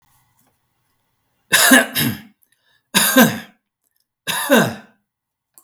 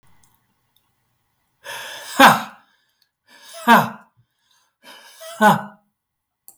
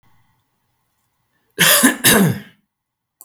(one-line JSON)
{"three_cough_length": "5.6 s", "three_cough_amplitude": 32768, "three_cough_signal_mean_std_ratio": 0.38, "exhalation_length": "6.6 s", "exhalation_amplitude": 32768, "exhalation_signal_mean_std_ratio": 0.27, "cough_length": "3.2 s", "cough_amplitude": 32768, "cough_signal_mean_std_ratio": 0.38, "survey_phase": "beta (2021-08-13 to 2022-03-07)", "age": "45-64", "gender": "Male", "wearing_mask": "No", "symptom_none": true, "smoker_status": "Ex-smoker", "respiratory_condition_asthma": false, "respiratory_condition_other": false, "recruitment_source": "REACT", "submission_delay": "1 day", "covid_test_result": "Negative", "covid_test_method": "RT-qPCR", "influenza_a_test_result": "Negative", "influenza_b_test_result": "Negative"}